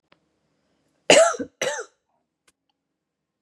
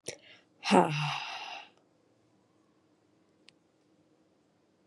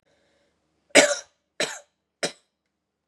{"cough_length": "3.4 s", "cough_amplitude": 32375, "cough_signal_mean_std_ratio": 0.25, "exhalation_length": "4.9 s", "exhalation_amplitude": 12828, "exhalation_signal_mean_std_ratio": 0.27, "three_cough_length": "3.1 s", "three_cough_amplitude": 30247, "three_cough_signal_mean_std_ratio": 0.23, "survey_phase": "beta (2021-08-13 to 2022-03-07)", "age": "18-44", "gender": "Female", "wearing_mask": "No", "symptom_cough_any": true, "symptom_runny_or_blocked_nose": true, "symptom_sore_throat": true, "smoker_status": "Never smoked", "respiratory_condition_asthma": false, "respiratory_condition_other": false, "recruitment_source": "Test and Trace", "submission_delay": "1 day", "covid_test_result": "Positive", "covid_test_method": "RT-qPCR"}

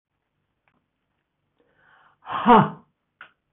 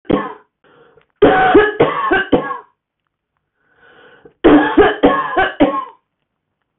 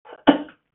{"exhalation_length": "3.5 s", "exhalation_amplitude": 24725, "exhalation_signal_mean_std_ratio": 0.23, "three_cough_length": "6.8 s", "three_cough_amplitude": 32482, "three_cough_signal_mean_std_ratio": 0.49, "cough_length": "0.7 s", "cough_amplitude": 29371, "cough_signal_mean_std_ratio": 0.29, "survey_phase": "beta (2021-08-13 to 2022-03-07)", "age": "65+", "gender": "Female", "wearing_mask": "No", "symptom_sore_throat": true, "smoker_status": "Ex-smoker", "respiratory_condition_asthma": false, "respiratory_condition_other": false, "recruitment_source": "REACT", "submission_delay": "1 day", "covid_test_result": "Negative", "covid_test_method": "RT-qPCR", "influenza_a_test_result": "Negative", "influenza_b_test_result": "Negative"}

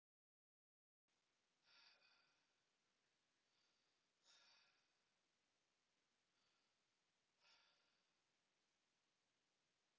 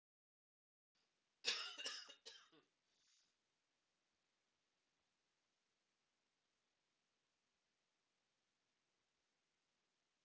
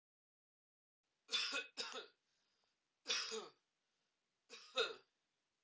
{"exhalation_length": "10.0 s", "exhalation_amplitude": 30, "exhalation_signal_mean_std_ratio": 0.58, "cough_length": "10.2 s", "cough_amplitude": 1388, "cough_signal_mean_std_ratio": 0.19, "three_cough_length": "5.6 s", "three_cough_amplitude": 1623, "three_cough_signal_mean_std_ratio": 0.35, "survey_phase": "alpha (2021-03-01 to 2021-08-12)", "age": "45-64", "gender": "Female", "wearing_mask": "No", "symptom_cough_any": true, "symptom_abdominal_pain": true, "symptom_diarrhoea": true, "symptom_fatigue": true, "symptom_fever_high_temperature": true, "symptom_headache": true, "smoker_status": "Never smoked", "respiratory_condition_asthma": false, "respiratory_condition_other": false, "recruitment_source": "Test and Trace", "submission_delay": "2 days", "covid_test_result": "Positive", "covid_test_method": "RT-qPCR", "covid_ct_value": 32.0, "covid_ct_gene": "ORF1ab gene", "covid_ct_mean": 34.4, "covid_viral_load": "5.2 copies/ml", "covid_viral_load_category": "Minimal viral load (< 10K copies/ml)"}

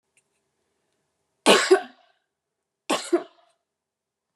{"cough_length": "4.4 s", "cough_amplitude": 24378, "cough_signal_mean_std_ratio": 0.25, "survey_phase": "beta (2021-08-13 to 2022-03-07)", "age": "65+", "gender": "Female", "wearing_mask": "No", "symptom_abdominal_pain": true, "symptom_headache": true, "symptom_onset": "12 days", "smoker_status": "Ex-smoker", "respiratory_condition_asthma": false, "respiratory_condition_other": false, "recruitment_source": "REACT", "submission_delay": "8 days", "covid_test_result": "Negative", "covid_test_method": "RT-qPCR", "influenza_a_test_result": "Negative", "influenza_b_test_result": "Negative"}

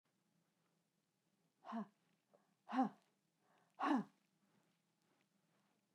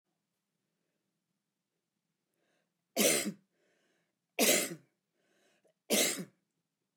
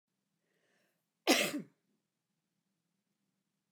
{"exhalation_length": "5.9 s", "exhalation_amplitude": 1729, "exhalation_signal_mean_std_ratio": 0.25, "three_cough_length": "7.0 s", "three_cough_amplitude": 7260, "three_cough_signal_mean_std_ratio": 0.29, "cough_length": "3.7 s", "cough_amplitude": 6341, "cough_signal_mean_std_ratio": 0.21, "survey_phase": "beta (2021-08-13 to 2022-03-07)", "age": "65+", "gender": "Female", "wearing_mask": "No", "symptom_none": true, "symptom_onset": "5 days", "smoker_status": "Never smoked", "respiratory_condition_asthma": false, "respiratory_condition_other": false, "recruitment_source": "REACT", "submission_delay": "2 days", "covid_test_result": "Negative", "covid_test_method": "RT-qPCR"}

